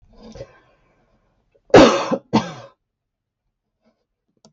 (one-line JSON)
{"cough_length": "4.5 s", "cough_amplitude": 32768, "cough_signal_mean_std_ratio": 0.24, "survey_phase": "beta (2021-08-13 to 2022-03-07)", "age": "65+", "gender": "Female", "wearing_mask": "No", "symptom_none": true, "smoker_status": "Ex-smoker", "respiratory_condition_asthma": false, "respiratory_condition_other": false, "recruitment_source": "REACT", "submission_delay": "1 day", "covid_test_result": "Negative", "covid_test_method": "RT-qPCR", "influenza_a_test_result": "Negative", "influenza_b_test_result": "Negative"}